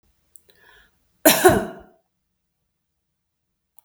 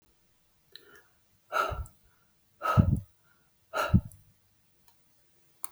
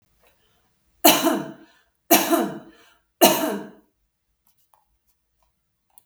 {"cough_length": "3.8 s", "cough_amplitude": 32766, "cough_signal_mean_std_ratio": 0.23, "exhalation_length": "5.7 s", "exhalation_amplitude": 16141, "exhalation_signal_mean_std_ratio": 0.29, "three_cough_length": "6.1 s", "three_cough_amplitude": 32768, "three_cough_signal_mean_std_ratio": 0.32, "survey_phase": "beta (2021-08-13 to 2022-03-07)", "age": "45-64", "gender": "Female", "wearing_mask": "No", "symptom_none": true, "smoker_status": "Never smoked", "respiratory_condition_asthma": false, "respiratory_condition_other": false, "recruitment_source": "REACT", "submission_delay": "4 days", "covid_test_result": "Negative", "covid_test_method": "RT-qPCR"}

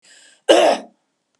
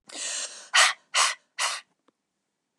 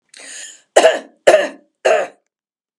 {"cough_length": "1.4 s", "cough_amplitude": 32768, "cough_signal_mean_std_ratio": 0.38, "exhalation_length": "2.8 s", "exhalation_amplitude": 18651, "exhalation_signal_mean_std_ratio": 0.41, "three_cough_length": "2.8 s", "three_cough_amplitude": 32768, "three_cough_signal_mean_std_ratio": 0.38, "survey_phase": "alpha (2021-03-01 to 2021-08-12)", "age": "45-64", "gender": "Female", "wearing_mask": "No", "symptom_none": true, "smoker_status": "Never smoked", "respiratory_condition_asthma": false, "respiratory_condition_other": true, "recruitment_source": "REACT", "submission_delay": "1 day", "covid_test_result": "Negative", "covid_test_method": "RT-qPCR"}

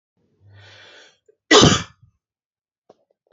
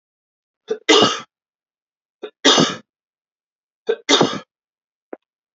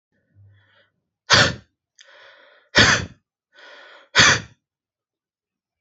{"cough_length": "3.3 s", "cough_amplitude": 30150, "cough_signal_mean_std_ratio": 0.24, "three_cough_length": "5.5 s", "three_cough_amplitude": 32767, "three_cough_signal_mean_std_ratio": 0.32, "exhalation_length": "5.8 s", "exhalation_amplitude": 32767, "exhalation_signal_mean_std_ratio": 0.29, "survey_phase": "beta (2021-08-13 to 2022-03-07)", "age": "18-44", "gender": "Male", "wearing_mask": "No", "symptom_none": true, "smoker_status": "Never smoked", "respiratory_condition_asthma": false, "respiratory_condition_other": false, "recruitment_source": "REACT", "submission_delay": "1 day", "covid_test_result": "Negative", "covid_test_method": "RT-qPCR"}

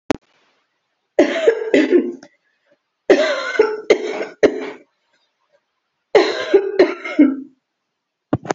{"three_cough_length": "8.5 s", "three_cough_amplitude": 32768, "three_cough_signal_mean_std_ratio": 0.44, "survey_phase": "beta (2021-08-13 to 2022-03-07)", "age": "45-64", "gender": "Female", "wearing_mask": "No", "symptom_cough_any": true, "symptom_runny_or_blocked_nose": true, "symptom_abdominal_pain": true, "symptom_fatigue": true, "symptom_headache": true, "symptom_change_to_sense_of_smell_or_taste": true, "smoker_status": "Never smoked", "respiratory_condition_asthma": false, "respiratory_condition_other": false, "recruitment_source": "Test and Trace", "submission_delay": "2 days", "covid_test_result": "Positive", "covid_test_method": "RT-qPCR", "covid_ct_value": 17.4, "covid_ct_gene": "ORF1ab gene", "covid_ct_mean": 18.4, "covid_viral_load": "910000 copies/ml", "covid_viral_load_category": "Low viral load (10K-1M copies/ml)"}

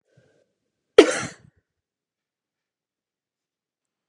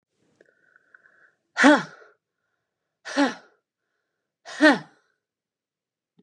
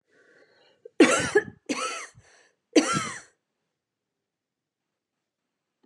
{"cough_length": "4.1 s", "cough_amplitude": 32768, "cough_signal_mean_std_ratio": 0.13, "exhalation_length": "6.2 s", "exhalation_amplitude": 30896, "exhalation_signal_mean_std_ratio": 0.23, "three_cough_length": "5.9 s", "three_cough_amplitude": 19649, "three_cough_signal_mean_std_ratio": 0.28, "survey_phase": "beta (2021-08-13 to 2022-03-07)", "age": "45-64", "gender": "Female", "wearing_mask": "No", "symptom_none": true, "symptom_onset": "13 days", "smoker_status": "Ex-smoker", "recruitment_source": "REACT", "submission_delay": "1 day", "covid_test_result": "Negative", "covid_test_method": "RT-qPCR", "influenza_a_test_result": "Negative", "influenza_b_test_result": "Negative"}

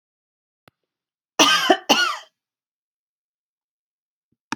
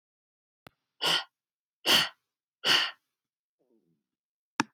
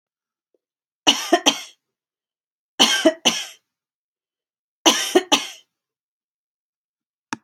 {"cough_length": "4.6 s", "cough_amplitude": 31552, "cough_signal_mean_std_ratio": 0.28, "exhalation_length": "4.7 s", "exhalation_amplitude": 17750, "exhalation_signal_mean_std_ratio": 0.29, "three_cough_length": "7.4 s", "three_cough_amplitude": 32767, "three_cough_signal_mean_std_ratio": 0.29, "survey_phase": "beta (2021-08-13 to 2022-03-07)", "age": "45-64", "gender": "Female", "wearing_mask": "No", "symptom_none": true, "smoker_status": "Ex-smoker", "respiratory_condition_asthma": false, "respiratory_condition_other": false, "recruitment_source": "REACT", "submission_delay": "2 days", "covid_test_result": "Negative", "covid_test_method": "RT-qPCR"}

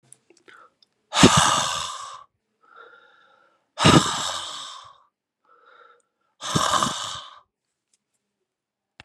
{"exhalation_length": "9.0 s", "exhalation_amplitude": 32338, "exhalation_signal_mean_std_ratio": 0.34, "survey_phase": "beta (2021-08-13 to 2022-03-07)", "age": "45-64", "gender": "Male", "wearing_mask": "No", "symptom_cough_any": true, "symptom_runny_or_blocked_nose": true, "symptom_sore_throat": true, "symptom_fatigue": true, "symptom_change_to_sense_of_smell_or_taste": true, "symptom_loss_of_taste": true, "symptom_onset": "2 days", "smoker_status": "Never smoked", "respiratory_condition_asthma": false, "respiratory_condition_other": false, "recruitment_source": "Test and Trace", "submission_delay": "2 days", "covid_test_result": "Positive", "covid_test_method": "LAMP"}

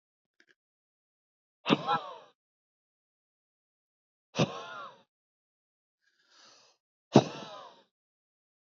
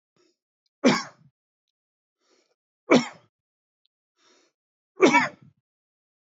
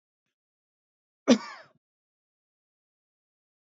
{"exhalation_length": "8.6 s", "exhalation_amplitude": 18278, "exhalation_signal_mean_std_ratio": 0.19, "three_cough_length": "6.3 s", "three_cough_amplitude": 20015, "three_cough_signal_mean_std_ratio": 0.23, "cough_length": "3.8 s", "cough_amplitude": 14031, "cough_signal_mean_std_ratio": 0.13, "survey_phase": "beta (2021-08-13 to 2022-03-07)", "age": "45-64", "gender": "Male", "wearing_mask": "No", "symptom_none": true, "smoker_status": "Ex-smoker", "respiratory_condition_asthma": false, "respiratory_condition_other": false, "recruitment_source": "REACT", "submission_delay": "1 day", "covid_test_result": "Negative", "covid_test_method": "RT-qPCR"}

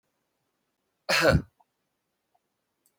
{"cough_length": "3.0 s", "cough_amplitude": 13883, "cough_signal_mean_std_ratio": 0.26, "survey_phase": "beta (2021-08-13 to 2022-03-07)", "age": "65+", "gender": "Male", "wearing_mask": "No", "symptom_none": true, "smoker_status": "Never smoked", "respiratory_condition_asthma": false, "respiratory_condition_other": false, "recruitment_source": "REACT", "submission_delay": "4 days", "covid_test_result": "Negative", "covid_test_method": "RT-qPCR", "influenza_a_test_result": "Negative", "influenza_b_test_result": "Negative"}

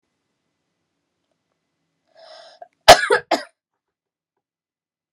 {"cough_length": "5.1 s", "cough_amplitude": 32768, "cough_signal_mean_std_ratio": 0.17, "survey_phase": "beta (2021-08-13 to 2022-03-07)", "age": "18-44", "gender": "Female", "wearing_mask": "No", "symptom_cough_any": true, "symptom_runny_or_blocked_nose": true, "symptom_sore_throat": true, "symptom_fatigue": true, "smoker_status": "Never smoked", "respiratory_condition_asthma": false, "respiratory_condition_other": false, "recruitment_source": "Test and Trace", "submission_delay": "1 day", "covid_test_result": "Positive", "covid_test_method": "RT-qPCR", "covid_ct_value": 19.6, "covid_ct_gene": "ORF1ab gene", "covid_ct_mean": 20.1, "covid_viral_load": "250000 copies/ml", "covid_viral_load_category": "Low viral load (10K-1M copies/ml)"}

